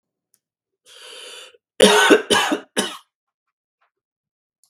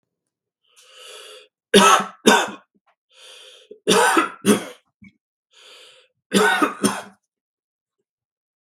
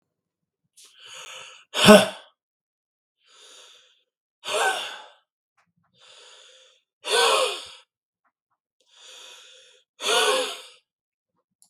{"cough_length": "4.7 s", "cough_amplitude": 32768, "cough_signal_mean_std_ratio": 0.32, "three_cough_length": "8.6 s", "three_cough_amplitude": 32768, "three_cough_signal_mean_std_ratio": 0.35, "exhalation_length": "11.7 s", "exhalation_amplitude": 32768, "exhalation_signal_mean_std_ratio": 0.27, "survey_phase": "beta (2021-08-13 to 2022-03-07)", "age": "45-64", "gender": "Male", "wearing_mask": "No", "symptom_sore_throat": true, "smoker_status": "Ex-smoker", "respiratory_condition_asthma": false, "respiratory_condition_other": false, "recruitment_source": "REACT", "submission_delay": "3 days", "covid_test_result": "Negative", "covid_test_method": "RT-qPCR", "influenza_a_test_result": "Unknown/Void", "influenza_b_test_result": "Unknown/Void"}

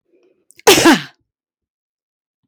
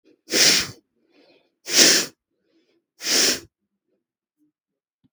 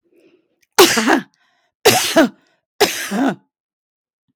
{"cough_length": "2.5 s", "cough_amplitude": 32768, "cough_signal_mean_std_ratio": 0.3, "exhalation_length": "5.1 s", "exhalation_amplitude": 32768, "exhalation_signal_mean_std_ratio": 0.35, "three_cough_length": "4.4 s", "three_cough_amplitude": 32768, "three_cough_signal_mean_std_ratio": 0.42, "survey_phase": "beta (2021-08-13 to 2022-03-07)", "age": "65+", "gender": "Female", "wearing_mask": "No", "symptom_none": true, "symptom_onset": "4 days", "smoker_status": "Never smoked", "respiratory_condition_asthma": false, "respiratory_condition_other": false, "recruitment_source": "REACT", "submission_delay": "2 days", "covid_test_result": "Negative", "covid_test_method": "RT-qPCR", "influenza_a_test_result": "Unknown/Void", "influenza_b_test_result": "Unknown/Void"}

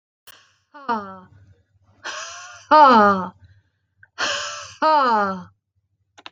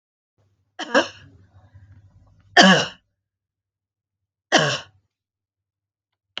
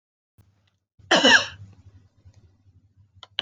{"exhalation_length": "6.3 s", "exhalation_amplitude": 28943, "exhalation_signal_mean_std_ratio": 0.4, "three_cough_length": "6.4 s", "three_cough_amplitude": 32768, "three_cough_signal_mean_std_ratio": 0.25, "cough_length": "3.4 s", "cough_amplitude": 22637, "cough_signal_mean_std_ratio": 0.26, "survey_phase": "beta (2021-08-13 to 2022-03-07)", "age": "45-64", "gender": "Female", "wearing_mask": "No", "symptom_none": true, "smoker_status": "Never smoked", "respiratory_condition_asthma": false, "respiratory_condition_other": false, "recruitment_source": "REACT", "submission_delay": "4 days", "covid_test_result": "Negative", "covid_test_method": "RT-qPCR", "influenza_a_test_result": "Negative", "influenza_b_test_result": "Negative"}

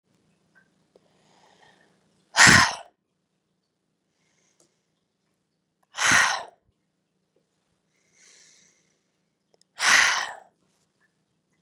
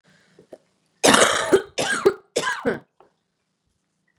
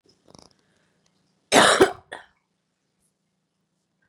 {"exhalation_length": "11.6 s", "exhalation_amplitude": 30003, "exhalation_signal_mean_std_ratio": 0.24, "three_cough_length": "4.2 s", "three_cough_amplitude": 32705, "three_cough_signal_mean_std_ratio": 0.38, "cough_length": "4.1 s", "cough_amplitude": 31938, "cough_signal_mean_std_ratio": 0.23, "survey_phase": "beta (2021-08-13 to 2022-03-07)", "age": "18-44", "gender": "Female", "wearing_mask": "No", "symptom_cough_any": true, "symptom_runny_or_blocked_nose": true, "symptom_sore_throat": true, "symptom_onset": "5 days", "smoker_status": "Ex-smoker", "respiratory_condition_asthma": false, "respiratory_condition_other": false, "recruitment_source": "Test and Trace", "submission_delay": "2 days", "covid_test_result": "Positive", "covid_test_method": "RT-qPCR", "covid_ct_value": 24.9, "covid_ct_gene": "ORF1ab gene", "covid_ct_mean": 25.4, "covid_viral_load": "4700 copies/ml", "covid_viral_load_category": "Minimal viral load (< 10K copies/ml)"}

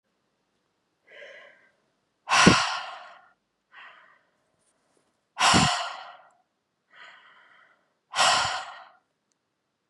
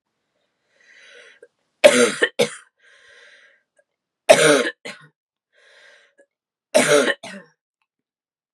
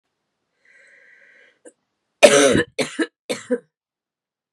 {"exhalation_length": "9.9 s", "exhalation_amplitude": 27254, "exhalation_signal_mean_std_ratio": 0.31, "three_cough_length": "8.5 s", "three_cough_amplitude": 32768, "three_cough_signal_mean_std_ratio": 0.29, "cough_length": "4.5 s", "cough_amplitude": 32768, "cough_signal_mean_std_ratio": 0.28, "survey_phase": "beta (2021-08-13 to 2022-03-07)", "age": "18-44", "gender": "Female", "wearing_mask": "No", "symptom_cough_any": true, "symptom_runny_or_blocked_nose": true, "symptom_fatigue": true, "symptom_headache": true, "symptom_onset": "4 days", "smoker_status": "Never smoked", "respiratory_condition_asthma": false, "respiratory_condition_other": false, "recruitment_source": "Test and Trace", "submission_delay": "1 day", "covid_test_result": "Positive", "covid_test_method": "RT-qPCR", "covid_ct_value": 15.6, "covid_ct_gene": "ORF1ab gene", "covid_ct_mean": 15.9, "covid_viral_load": "6100000 copies/ml", "covid_viral_load_category": "High viral load (>1M copies/ml)"}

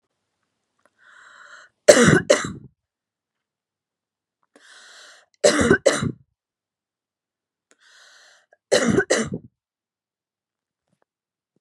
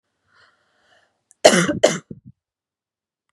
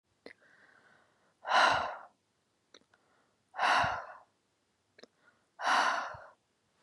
{"three_cough_length": "11.6 s", "three_cough_amplitude": 32768, "three_cough_signal_mean_std_ratio": 0.27, "cough_length": "3.3 s", "cough_amplitude": 32768, "cough_signal_mean_std_ratio": 0.25, "exhalation_length": "6.8 s", "exhalation_amplitude": 6870, "exhalation_signal_mean_std_ratio": 0.37, "survey_phase": "beta (2021-08-13 to 2022-03-07)", "age": "18-44", "gender": "Female", "wearing_mask": "No", "symptom_none": true, "smoker_status": "Never smoked", "respiratory_condition_asthma": false, "respiratory_condition_other": false, "recruitment_source": "REACT", "submission_delay": "4 days", "covid_test_result": "Negative", "covid_test_method": "RT-qPCR", "influenza_a_test_result": "Negative", "influenza_b_test_result": "Negative"}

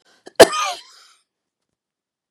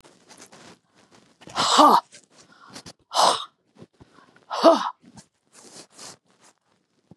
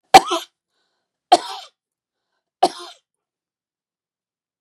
{"cough_length": "2.3 s", "cough_amplitude": 32768, "cough_signal_mean_std_ratio": 0.2, "exhalation_length": "7.2 s", "exhalation_amplitude": 26317, "exhalation_signal_mean_std_ratio": 0.3, "three_cough_length": "4.6 s", "three_cough_amplitude": 32768, "three_cough_signal_mean_std_ratio": 0.18, "survey_phase": "beta (2021-08-13 to 2022-03-07)", "age": "65+", "gender": "Female", "wearing_mask": "No", "symptom_none": true, "smoker_status": "Ex-smoker", "respiratory_condition_asthma": false, "respiratory_condition_other": false, "recruitment_source": "REACT", "submission_delay": "1 day", "covid_test_result": "Negative", "covid_test_method": "RT-qPCR"}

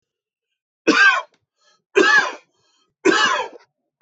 {"three_cough_length": "4.0 s", "three_cough_amplitude": 25056, "three_cough_signal_mean_std_ratio": 0.43, "survey_phase": "beta (2021-08-13 to 2022-03-07)", "age": "45-64", "gender": "Male", "wearing_mask": "No", "symptom_fatigue": true, "symptom_onset": "12 days", "smoker_status": "Never smoked", "respiratory_condition_asthma": false, "respiratory_condition_other": false, "recruitment_source": "REACT", "submission_delay": "1 day", "covid_test_result": "Negative", "covid_test_method": "RT-qPCR"}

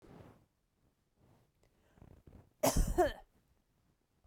{"cough_length": "4.3 s", "cough_amplitude": 4489, "cough_signal_mean_std_ratio": 0.28, "survey_phase": "beta (2021-08-13 to 2022-03-07)", "age": "45-64", "gender": "Female", "wearing_mask": "No", "symptom_cough_any": true, "symptom_runny_or_blocked_nose": true, "symptom_shortness_of_breath": true, "symptom_abdominal_pain": true, "symptom_fatigue": true, "symptom_fever_high_temperature": true, "symptom_headache": true, "symptom_other": true, "smoker_status": "Never smoked", "respiratory_condition_asthma": false, "respiratory_condition_other": false, "recruitment_source": "Test and Trace", "submission_delay": "1 day", "covid_test_result": "Positive", "covid_test_method": "LFT"}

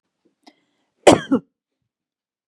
{"cough_length": "2.5 s", "cough_amplitude": 32768, "cough_signal_mean_std_ratio": 0.21, "survey_phase": "beta (2021-08-13 to 2022-03-07)", "age": "18-44", "gender": "Female", "wearing_mask": "No", "symptom_none": true, "symptom_onset": "6 days", "smoker_status": "Never smoked", "respiratory_condition_asthma": false, "respiratory_condition_other": false, "recruitment_source": "REACT", "submission_delay": "7 days", "covid_test_result": "Negative", "covid_test_method": "RT-qPCR", "influenza_a_test_result": "Negative", "influenza_b_test_result": "Negative"}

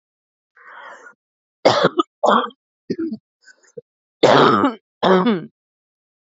{"cough_length": "6.3 s", "cough_amplitude": 32767, "cough_signal_mean_std_ratio": 0.4, "survey_phase": "beta (2021-08-13 to 2022-03-07)", "age": "18-44", "gender": "Female", "wearing_mask": "No", "symptom_sore_throat": true, "symptom_onset": "8 days", "smoker_status": "Current smoker (e-cigarettes or vapes only)", "respiratory_condition_asthma": false, "respiratory_condition_other": false, "recruitment_source": "REACT", "submission_delay": "18 days", "covid_test_result": "Negative", "covid_test_method": "RT-qPCR", "influenza_a_test_result": "Negative", "influenza_b_test_result": "Negative"}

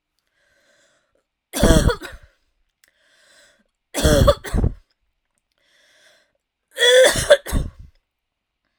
{"three_cough_length": "8.8 s", "three_cough_amplitude": 32768, "three_cough_signal_mean_std_ratio": 0.35, "survey_phase": "alpha (2021-03-01 to 2021-08-12)", "age": "18-44", "gender": "Female", "wearing_mask": "No", "symptom_none": true, "symptom_onset": "4 days", "smoker_status": "Never smoked", "respiratory_condition_asthma": false, "respiratory_condition_other": false, "recruitment_source": "REACT", "submission_delay": "2 days", "covid_test_result": "Negative", "covid_test_method": "RT-qPCR"}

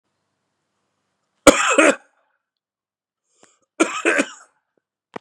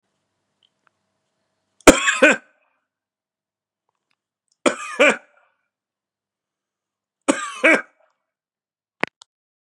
{"cough_length": "5.2 s", "cough_amplitude": 32768, "cough_signal_mean_std_ratio": 0.27, "three_cough_length": "9.7 s", "three_cough_amplitude": 32768, "three_cough_signal_mean_std_ratio": 0.22, "survey_phase": "beta (2021-08-13 to 2022-03-07)", "age": "45-64", "gender": "Male", "wearing_mask": "No", "symptom_shortness_of_breath": true, "symptom_fatigue": true, "symptom_headache": true, "symptom_change_to_sense_of_smell_or_taste": true, "symptom_loss_of_taste": true, "symptom_onset": "3 days", "smoker_status": "Current smoker (e-cigarettes or vapes only)", "respiratory_condition_asthma": false, "respiratory_condition_other": false, "recruitment_source": "Test and Trace", "submission_delay": "2 days", "covid_test_result": "Positive", "covid_test_method": "RT-qPCR", "covid_ct_value": 21.8, "covid_ct_gene": "ORF1ab gene", "covid_ct_mean": 22.9, "covid_viral_load": "30000 copies/ml", "covid_viral_load_category": "Low viral load (10K-1M copies/ml)"}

